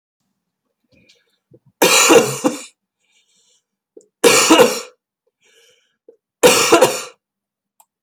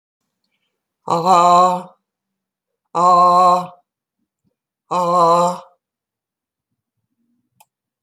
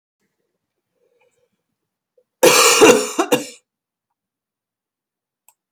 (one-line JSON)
{"three_cough_length": "8.0 s", "three_cough_amplitude": 32768, "three_cough_signal_mean_std_ratio": 0.37, "exhalation_length": "8.0 s", "exhalation_amplitude": 28228, "exhalation_signal_mean_std_ratio": 0.42, "cough_length": "5.7 s", "cough_amplitude": 32768, "cough_signal_mean_std_ratio": 0.29, "survey_phase": "beta (2021-08-13 to 2022-03-07)", "age": "65+", "gender": "Female", "wearing_mask": "No", "symptom_cough_any": true, "symptom_runny_or_blocked_nose": true, "symptom_fatigue": true, "smoker_status": "Never smoked", "respiratory_condition_asthma": true, "respiratory_condition_other": true, "recruitment_source": "REACT", "submission_delay": "3 days", "covid_test_result": "Negative", "covid_test_method": "RT-qPCR", "influenza_a_test_result": "Unknown/Void", "influenza_b_test_result": "Unknown/Void"}